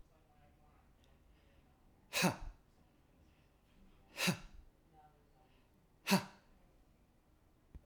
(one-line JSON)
{"exhalation_length": "7.9 s", "exhalation_amplitude": 3829, "exhalation_signal_mean_std_ratio": 0.27, "survey_phase": "alpha (2021-03-01 to 2021-08-12)", "age": "45-64", "gender": "Male", "wearing_mask": "Yes", "symptom_none": true, "smoker_status": "Never smoked", "respiratory_condition_asthma": false, "respiratory_condition_other": false, "recruitment_source": "Test and Trace", "submission_delay": "0 days", "covid_test_result": "Negative", "covid_test_method": "LFT"}